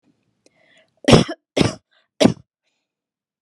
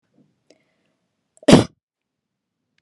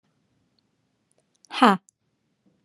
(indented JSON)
{
  "three_cough_length": "3.4 s",
  "three_cough_amplitude": 32768,
  "three_cough_signal_mean_std_ratio": 0.25,
  "cough_length": "2.8 s",
  "cough_amplitude": 32768,
  "cough_signal_mean_std_ratio": 0.18,
  "exhalation_length": "2.6 s",
  "exhalation_amplitude": 28249,
  "exhalation_signal_mean_std_ratio": 0.19,
  "survey_phase": "alpha (2021-03-01 to 2021-08-12)",
  "age": "18-44",
  "gender": "Female",
  "wearing_mask": "No",
  "symptom_none": true,
  "smoker_status": "Never smoked",
  "respiratory_condition_asthma": false,
  "respiratory_condition_other": false,
  "recruitment_source": "REACT",
  "submission_delay": "1 day",
  "covid_test_result": "Negative",
  "covid_test_method": "RT-qPCR"
}